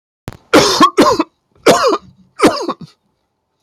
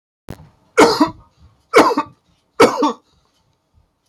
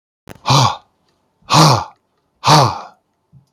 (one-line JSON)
{"cough_length": "3.6 s", "cough_amplitude": 32767, "cough_signal_mean_std_ratio": 0.49, "three_cough_length": "4.1 s", "three_cough_amplitude": 30967, "three_cough_signal_mean_std_ratio": 0.36, "exhalation_length": "3.5 s", "exhalation_amplitude": 32767, "exhalation_signal_mean_std_ratio": 0.43, "survey_phase": "beta (2021-08-13 to 2022-03-07)", "age": "65+", "gender": "Male", "wearing_mask": "No", "symptom_none": true, "smoker_status": "Never smoked", "respiratory_condition_asthma": false, "respiratory_condition_other": false, "recruitment_source": "REACT", "submission_delay": "1 day", "covid_test_result": "Negative", "covid_test_method": "RT-qPCR", "influenza_a_test_result": "Unknown/Void", "influenza_b_test_result": "Unknown/Void"}